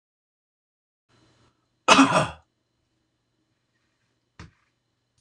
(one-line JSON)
{"cough_length": "5.2 s", "cough_amplitude": 25910, "cough_signal_mean_std_ratio": 0.21, "survey_phase": "beta (2021-08-13 to 2022-03-07)", "age": "65+", "gender": "Male", "wearing_mask": "No", "symptom_none": true, "smoker_status": "Never smoked", "respiratory_condition_asthma": false, "respiratory_condition_other": false, "recruitment_source": "REACT", "submission_delay": "1 day", "covid_test_result": "Negative", "covid_test_method": "RT-qPCR"}